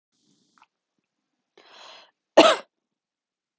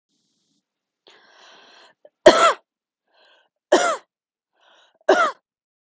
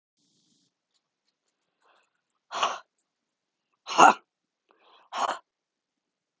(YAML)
cough_length: 3.6 s
cough_amplitude: 31924
cough_signal_mean_std_ratio: 0.18
three_cough_length: 5.9 s
three_cough_amplitude: 32768
three_cough_signal_mean_std_ratio: 0.26
exhalation_length: 6.4 s
exhalation_amplitude: 28996
exhalation_signal_mean_std_ratio: 0.19
survey_phase: alpha (2021-03-01 to 2021-08-12)
age: 18-44
gender: Female
wearing_mask: 'No'
symptom_none: true
smoker_status: Current smoker (11 or more cigarettes per day)
respiratory_condition_asthma: false
respiratory_condition_other: false
recruitment_source: REACT
submission_delay: 1 day
covid_test_result: Negative
covid_test_method: RT-qPCR